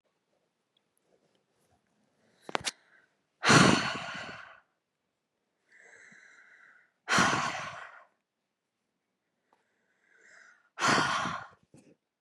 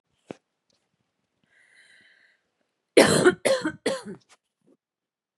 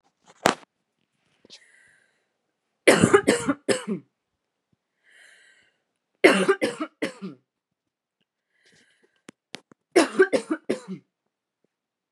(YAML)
exhalation_length: 12.2 s
exhalation_amplitude: 15095
exhalation_signal_mean_std_ratio: 0.29
cough_length: 5.4 s
cough_amplitude: 25982
cough_signal_mean_std_ratio: 0.27
three_cough_length: 12.1 s
three_cough_amplitude: 32768
three_cough_signal_mean_std_ratio: 0.28
survey_phase: beta (2021-08-13 to 2022-03-07)
age: 18-44
gender: Female
wearing_mask: 'No'
symptom_abdominal_pain: true
symptom_headache: true
symptom_onset: 12 days
smoker_status: Current smoker (e-cigarettes or vapes only)
respiratory_condition_asthma: false
respiratory_condition_other: false
recruitment_source: REACT
submission_delay: 2 days
covid_test_result: Negative
covid_test_method: RT-qPCR
influenza_a_test_result: Unknown/Void
influenza_b_test_result: Unknown/Void